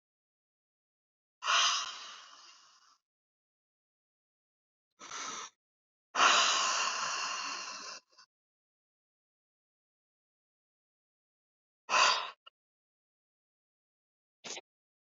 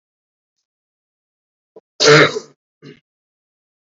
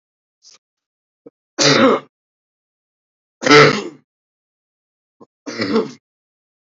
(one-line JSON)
{"exhalation_length": "15.0 s", "exhalation_amplitude": 7841, "exhalation_signal_mean_std_ratio": 0.32, "cough_length": "3.9 s", "cough_amplitude": 32767, "cough_signal_mean_std_ratio": 0.24, "three_cough_length": "6.7 s", "three_cough_amplitude": 32555, "three_cough_signal_mean_std_ratio": 0.3, "survey_phase": "beta (2021-08-13 to 2022-03-07)", "age": "18-44", "gender": "Male", "wearing_mask": "No", "symptom_shortness_of_breath": true, "symptom_abdominal_pain": true, "symptom_diarrhoea": true, "symptom_fatigue": true, "symptom_headache": true, "symptom_onset": "12 days", "smoker_status": "Never smoked", "respiratory_condition_asthma": true, "respiratory_condition_other": false, "recruitment_source": "REACT", "submission_delay": "4 days", "covid_test_result": "Negative", "covid_test_method": "RT-qPCR", "influenza_a_test_result": "Unknown/Void", "influenza_b_test_result": "Unknown/Void"}